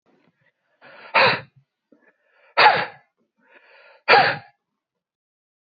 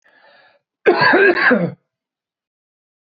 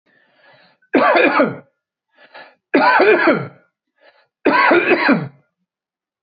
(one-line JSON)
{"exhalation_length": "5.7 s", "exhalation_amplitude": 27168, "exhalation_signal_mean_std_ratio": 0.29, "cough_length": "3.1 s", "cough_amplitude": 25987, "cough_signal_mean_std_ratio": 0.43, "three_cough_length": "6.2 s", "three_cough_amplitude": 26590, "three_cough_signal_mean_std_ratio": 0.5, "survey_phase": "beta (2021-08-13 to 2022-03-07)", "age": "45-64", "gender": "Male", "wearing_mask": "No", "symptom_runny_or_blocked_nose": true, "smoker_status": "Never smoked", "respiratory_condition_asthma": false, "respiratory_condition_other": false, "recruitment_source": "REACT", "submission_delay": "1 day", "covid_test_result": "Negative", "covid_test_method": "RT-qPCR", "influenza_a_test_result": "Unknown/Void", "influenza_b_test_result": "Unknown/Void"}